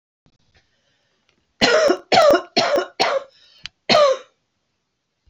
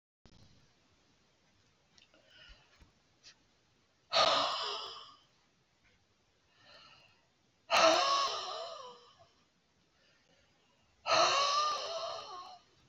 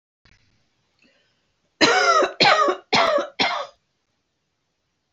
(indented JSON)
{
  "three_cough_length": "5.3 s",
  "three_cough_amplitude": 27618,
  "three_cough_signal_mean_std_ratio": 0.44,
  "exhalation_length": "12.9 s",
  "exhalation_amplitude": 6902,
  "exhalation_signal_mean_std_ratio": 0.38,
  "cough_length": "5.1 s",
  "cough_amplitude": 29069,
  "cough_signal_mean_std_ratio": 0.43,
  "survey_phase": "beta (2021-08-13 to 2022-03-07)",
  "age": "65+",
  "gender": "Female",
  "wearing_mask": "No",
  "symptom_none": true,
  "symptom_onset": "10 days",
  "smoker_status": "Ex-smoker",
  "respiratory_condition_asthma": false,
  "respiratory_condition_other": false,
  "recruitment_source": "REACT",
  "submission_delay": "1 day",
  "covid_test_result": "Negative",
  "covid_test_method": "RT-qPCR",
  "influenza_a_test_result": "Negative",
  "influenza_b_test_result": "Negative"
}